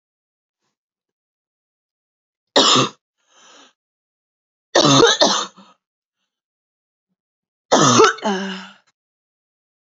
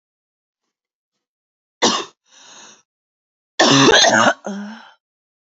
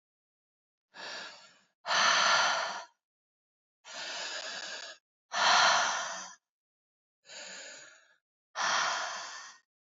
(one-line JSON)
{"three_cough_length": "9.9 s", "three_cough_amplitude": 29987, "three_cough_signal_mean_std_ratio": 0.32, "cough_length": "5.5 s", "cough_amplitude": 31312, "cough_signal_mean_std_ratio": 0.36, "exhalation_length": "9.9 s", "exhalation_amplitude": 9826, "exhalation_signal_mean_std_ratio": 0.46, "survey_phase": "alpha (2021-03-01 to 2021-08-12)", "age": "18-44", "gender": "Female", "wearing_mask": "No", "symptom_cough_any": true, "symptom_shortness_of_breath": true, "symptom_diarrhoea": true, "symptom_fatigue": true, "symptom_fever_high_temperature": true, "symptom_headache": true, "symptom_onset": "2 days", "smoker_status": "Current smoker (1 to 10 cigarettes per day)", "respiratory_condition_asthma": true, "respiratory_condition_other": false, "recruitment_source": "Test and Trace", "submission_delay": "1 day", "covid_test_result": "Positive", "covid_test_method": "RT-qPCR"}